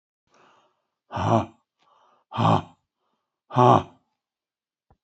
exhalation_length: 5.0 s
exhalation_amplitude: 24267
exhalation_signal_mean_std_ratio: 0.29
survey_phase: beta (2021-08-13 to 2022-03-07)
age: 65+
gender: Male
wearing_mask: 'Yes'
symptom_none: true
smoker_status: Ex-smoker
respiratory_condition_asthma: false
respiratory_condition_other: false
recruitment_source: REACT
submission_delay: 1 day
covid_test_result: Negative
covid_test_method: RT-qPCR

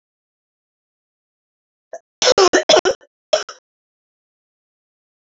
three_cough_length: 5.4 s
three_cough_amplitude: 31653
three_cough_signal_mean_std_ratio: 0.26
survey_phase: alpha (2021-03-01 to 2021-08-12)
age: 18-44
gender: Female
wearing_mask: 'No'
symptom_new_continuous_cough: true
symptom_fatigue: true
smoker_status: Never smoked
respiratory_condition_asthma: true
respiratory_condition_other: false
recruitment_source: Test and Trace
submission_delay: 1 day
covid_test_result: Positive
covid_test_method: RT-qPCR
covid_ct_value: 22.2
covid_ct_gene: ORF1ab gene
covid_ct_mean: 23.4
covid_viral_load: 21000 copies/ml
covid_viral_load_category: Low viral load (10K-1M copies/ml)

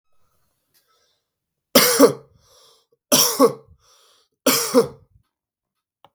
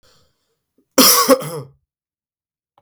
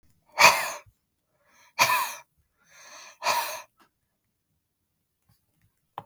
three_cough_length: 6.1 s
three_cough_amplitude: 32768
three_cough_signal_mean_std_ratio: 0.32
cough_length: 2.8 s
cough_amplitude: 32768
cough_signal_mean_std_ratio: 0.33
exhalation_length: 6.1 s
exhalation_amplitude: 30878
exhalation_signal_mean_std_ratio: 0.28
survey_phase: beta (2021-08-13 to 2022-03-07)
age: 18-44
gender: Male
wearing_mask: 'No'
symptom_none: true
smoker_status: Ex-smoker
respiratory_condition_asthma: false
respiratory_condition_other: false
recruitment_source: REACT
submission_delay: 2 days
covid_test_result: Negative
covid_test_method: RT-qPCR
influenza_a_test_result: Negative
influenza_b_test_result: Negative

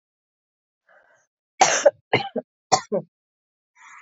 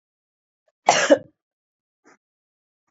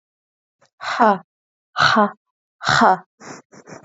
three_cough_length: 4.0 s
three_cough_amplitude: 26987
three_cough_signal_mean_std_ratio: 0.27
cough_length: 2.9 s
cough_amplitude: 27413
cough_signal_mean_std_ratio: 0.22
exhalation_length: 3.8 s
exhalation_amplitude: 30231
exhalation_signal_mean_std_ratio: 0.38
survey_phase: beta (2021-08-13 to 2022-03-07)
age: 18-44
gender: Female
wearing_mask: 'No'
symptom_none: true
smoker_status: Ex-smoker
respiratory_condition_asthma: false
respiratory_condition_other: false
recruitment_source: REACT
submission_delay: 5 days
covid_test_result: Negative
covid_test_method: RT-qPCR
influenza_a_test_result: Negative
influenza_b_test_result: Negative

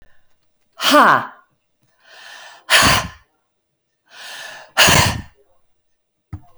exhalation_length: 6.6 s
exhalation_amplitude: 32768
exhalation_signal_mean_std_ratio: 0.36
survey_phase: beta (2021-08-13 to 2022-03-07)
age: 65+
gender: Female
wearing_mask: 'No'
symptom_none: true
smoker_status: Never smoked
respiratory_condition_asthma: false
respiratory_condition_other: false
recruitment_source: REACT
submission_delay: 15 days
covid_test_result: Negative
covid_test_method: RT-qPCR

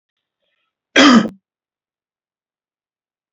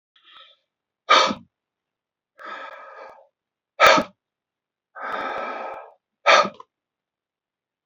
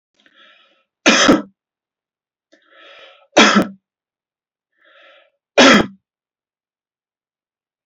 cough_length: 3.3 s
cough_amplitude: 30585
cough_signal_mean_std_ratio: 0.25
exhalation_length: 7.9 s
exhalation_amplitude: 27374
exhalation_signal_mean_std_ratio: 0.29
three_cough_length: 7.9 s
three_cough_amplitude: 32198
three_cough_signal_mean_std_ratio: 0.28
survey_phase: beta (2021-08-13 to 2022-03-07)
age: 45-64
gender: Male
wearing_mask: 'No'
symptom_none: true
smoker_status: Never smoked
respiratory_condition_asthma: false
respiratory_condition_other: false
recruitment_source: REACT
submission_delay: 2 days
covid_test_result: Negative
covid_test_method: RT-qPCR
influenza_a_test_result: Negative
influenza_b_test_result: Negative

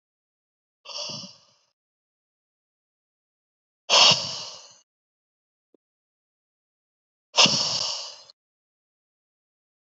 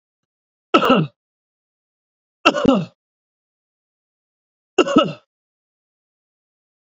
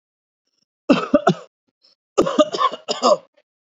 exhalation_length: 9.8 s
exhalation_amplitude: 28047
exhalation_signal_mean_std_ratio: 0.25
three_cough_length: 6.9 s
three_cough_amplitude: 28422
three_cough_signal_mean_std_ratio: 0.27
cough_length: 3.7 s
cough_amplitude: 28324
cough_signal_mean_std_ratio: 0.38
survey_phase: alpha (2021-03-01 to 2021-08-12)
age: 45-64
gender: Male
wearing_mask: 'No'
symptom_none: true
smoker_status: Ex-smoker
respiratory_condition_asthma: false
respiratory_condition_other: false
recruitment_source: REACT
submission_delay: 1 day
covid_test_result: Negative
covid_test_method: RT-qPCR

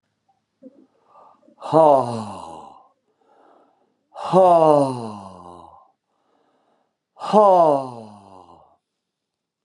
exhalation_length: 9.6 s
exhalation_amplitude: 28514
exhalation_signal_mean_std_ratio: 0.36
survey_phase: beta (2021-08-13 to 2022-03-07)
age: 65+
gender: Male
wearing_mask: 'No'
symptom_new_continuous_cough: true
symptom_runny_or_blocked_nose: true
symptom_sore_throat: true
symptom_fatigue: true
smoker_status: Ex-smoker
respiratory_condition_asthma: false
respiratory_condition_other: false
recruitment_source: Test and Trace
submission_delay: 1 day
covid_test_result: Positive
covid_test_method: RT-qPCR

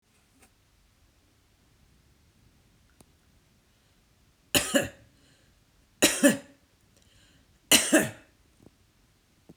three_cough_length: 9.6 s
three_cough_amplitude: 20712
three_cough_signal_mean_std_ratio: 0.24
survey_phase: beta (2021-08-13 to 2022-03-07)
age: 45-64
gender: Female
wearing_mask: 'No'
symptom_none: true
smoker_status: Ex-smoker
respiratory_condition_asthma: false
respiratory_condition_other: false
recruitment_source: REACT
submission_delay: 1 day
covid_test_result: Negative
covid_test_method: RT-qPCR
covid_ct_value: 37.0
covid_ct_gene: N gene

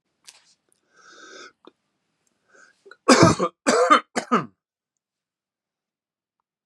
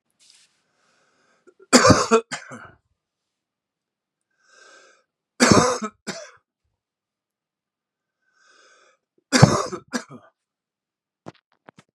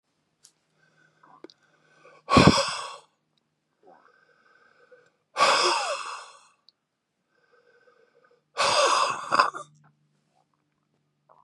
cough_length: 6.7 s
cough_amplitude: 31016
cough_signal_mean_std_ratio: 0.27
three_cough_length: 11.9 s
three_cough_amplitude: 32768
three_cough_signal_mean_std_ratio: 0.24
exhalation_length: 11.4 s
exhalation_amplitude: 26215
exhalation_signal_mean_std_ratio: 0.32
survey_phase: beta (2021-08-13 to 2022-03-07)
age: 65+
gender: Male
wearing_mask: 'No'
symptom_cough_any: true
symptom_runny_or_blocked_nose: true
symptom_sore_throat: true
symptom_fatigue: true
symptom_fever_high_temperature: true
symptom_change_to_sense_of_smell_or_taste: true
smoker_status: Ex-smoker
respiratory_condition_asthma: false
respiratory_condition_other: false
recruitment_source: Test and Trace
submission_delay: 1 day
covid_test_result: Positive
covid_test_method: LFT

